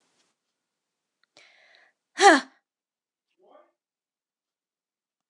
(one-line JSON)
{"exhalation_length": "5.3 s", "exhalation_amplitude": 25242, "exhalation_signal_mean_std_ratio": 0.15, "survey_phase": "beta (2021-08-13 to 2022-03-07)", "age": "18-44", "gender": "Female", "wearing_mask": "No", "symptom_cough_any": true, "symptom_new_continuous_cough": true, "symptom_runny_or_blocked_nose": true, "symptom_shortness_of_breath": true, "symptom_sore_throat": true, "symptom_abdominal_pain": true, "symptom_fatigue": true, "symptom_fever_high_temperature": true, "symptom_headache": true, "symptom_onset": "5 days", "smoker_status": "Ex-smoker", "respiratory_condition_asthma": true, "respiratory_condition_other": false, "recruitment_source": "REACT", "submission_delay": "0 days", "covid_test_result": "Positive", "covid_test_method": "RT-qPCR", "covid_ct_value": 22.0, "covid_ct_gene": "E gene", "influenza_a_test_result": "Negative", "influenza_b_test_result": "Negative"}